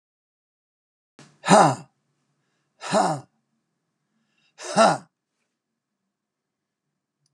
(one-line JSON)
{"exhalation_length": "7.3 s", "exhalation_amplitude": 27586, "exhalation_signal_mean_std_ratio": 0.25, "survey_phase": "beta (2021-08-13 to 2022-03-07)", "age": "65+", "gender": "Male", "wearing_mask": "No", "symptom_none": true, "smoker_status": "Ex-smoker", "respiratory_condition_asthma": false, "respiratory_condition_other": false, "recruitment_source": "REACT", "submission_delay": "3 days", "covid_test_result": "Negative", "covid_test_method": "RT-qPCR"}